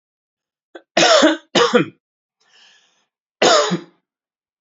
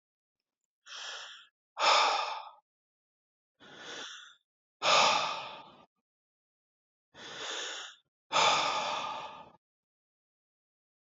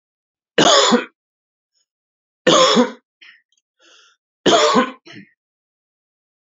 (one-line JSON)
{"cough_length": "4.6 s", "cough_amplitude": 31945, "cough_signal_mean_std_ratio": 0.39, "exhalation_length": "11.2 s", "exhalation_amplitude": 10548, "exhalation_signal_mean_std_ratio": 0.39, "three_cough_length": "6.5 s", "three_cough_amplitude": 29074, "three_cough_signal_mean_std_ratio": 0.37, "survey_phase": "alpha (2021-03-01 to 2021-08-12)", "age": "18-44", "gender": "Male", "wearing_mask": "No", "symptom_abdominal_pain": true, "symptom_fatigue": true, "symptom_headache": true, "symptom_onset": "4 days", "smoker_status": "Never smoked", "respiratory_condition_asthma": false, "respiratory_condition_other": false, "recruitment_source": "Test and Trace", "submission_delay": "2 days", "covid_test_result": "Positive", "covid_test_method": "RT-qPCR"}